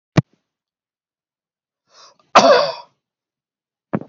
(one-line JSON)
{"cough_length": "4.1 s", "cough_amplitude": 28896, "cough_signal_mean_std_ratio": 0.25, "survey_phase": "beta (2021-08-13 to 2022-03-07)", "age": "65+", "gender": "Male", "wearing_mask": "No", "symptom_none": true, "smoker_status": "Never smoked", "respiratory_condition_asthma": true, "respiratory_condition_other": false, "recruitment_source": "REACT", "submission_delay": "2 days", "covid_test_result": "Negative", "covid_test_method": "RT-qPCR"}